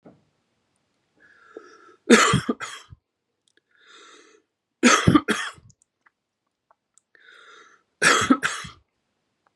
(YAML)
three_cough_length: 9.6 s
three_cough_amplitude: 31561
three_cough_signal_mean_std_ratio: 0.29
survey_phase: beta (2021-08-13 to 2022-03-07)
age: 45-64
gender: Male
wearing_mask: 'No'
symptom_cough_any: true
symptom_runny_or_blocked_nose: true
symptom_fatigue: true
symptom_fever_high_temperature: true
symptom_loss_of_taste: true
symptom_onset: 2 days
smoker_status: Ex-smoker
respiratory_condition_asthma: false
respiratory_condition_other: false
recruitment_source: Test and Trace
submission_delay: 1 day
covid_test_result: Positive
covid_test_method: ePCR